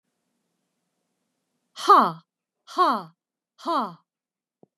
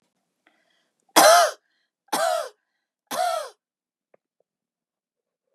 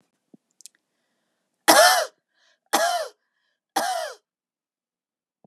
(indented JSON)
{
  "exhalation_length": "4.8 s",
  "exhalation_amplitude": 19957,
  "exhalation_signal_mean_std_ratio": 0.28,
  "three_cough_length": "5.5 s",
  "three_cough_amplitude": 32159,
  "three_cough_signal_mean_std_ratio": 0.3,
  "cough_length": "5.5 s",
  "cough_amplitude": 31316,
  "cough_signal_mean_std_ratio": 0.31,
  "survey_phase": "beta (2021-08-13 to 2022-03-07)",
  "age": "45-64",
  "gender": "Female",
  "wearing_mask": "No",
  "symptom_none": true,
  "smoker_status": "Never smoked",
  "respiratory_condition_asthma": false,
  "respiratory_condition_other": false,
  "recruitment_source": "Test and Trace",
  "submission_delay": "1 day",
  "covid_test_result": "Positive",
  "covid_test_method": "ePCR"
}